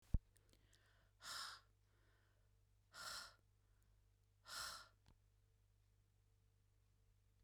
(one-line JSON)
{"exhalation_length": "7.4 s", "exhalation_amplitude": 1938, "exhalation_signal_mean_std_ratio": 0.28, "survey_phase": "beta (2021-08-13 to 2022-03-07)", "age": "45-64", "gender": "Female", "wearing_mask": "No", "symptom_none": true, "smoker_status": "Never smoked", "respiratory_condition_asthma": false, "respiratory_condition_other": false, "recruitment_source": "REACT", "submission_delay": "2 days", "covid_test_result": "Negative", "covid_test_method": "RT-qPCR", "influenza_a_test_result": "Negative", "influenza_b_test_result": "Negative"}